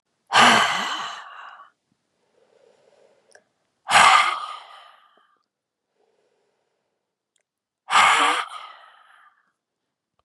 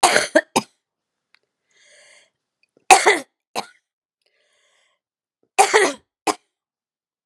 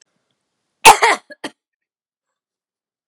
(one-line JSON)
{"exhalation_length": "10.2 s", "exhalation_amplitude": 29299, "exhalation_signal_mean_std_ratio": 0.33, "three_cough_length": "7.3 s", "three_cough_amplitude": 32768, "three_cough_signal_mean_std_ratio": 0.27, "cough_length": "3.1 s", "cough_amplitude": 32768, "cough_signal_mean_std_ratio": 0.21, "survey_phase": "beta (2021-08-13 to 2022-03-07)", "age": "65+", "gender": "Female", "wearing_mask": "No", "symptom_runny_or_blocked_nose": true, "symptom_sore_throat": true, "smoker_status": "Never smoked", "respiratory_condition_asthma": false, "respiratory_condition_other": false, "recruitment_source": "REACT", "submission_delay": "2 days", "covid_test_result": "Negative", "covid_test_method": "RT-qPCR", "influenza_a_test_result": "Negative", "influenza_b_test_result": "Negative"}